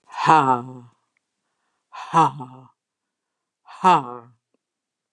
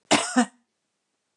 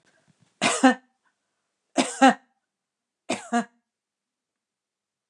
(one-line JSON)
{"exhalation_length": "5.1 s", "exhalation_amplitude": 29740, "exhalation_signal_mean_std_ratio": 0.32, "cough_length": "1.4 s", "cough_amplitude": 16489, "cough_signal_mean_std_ratio": 0.34, "three_cough_length": "5.3 s", "three_cough_amplitude": 24751, "three_cough_signal_mean_std_ratio": 0.25, "survey_phase": "beta (2021-08-13 to 2022-03-07)", "age": "65+", "gender": "Female", "wearing_mask": "No", "symptom_headache": true, "smoker_status": "Ex-smoker", "respiratory_condition_asthma": false, "respiratory_condition_other": false, "recruitment_source": "REACT", "submission_delay": "1 day", "covid_test_result": "Negative", "covid_test_method": "RT-qPCR", "influenza_a_test_result": "Unknown/Void", "influenza_b_test_result": "Unknown/Void"}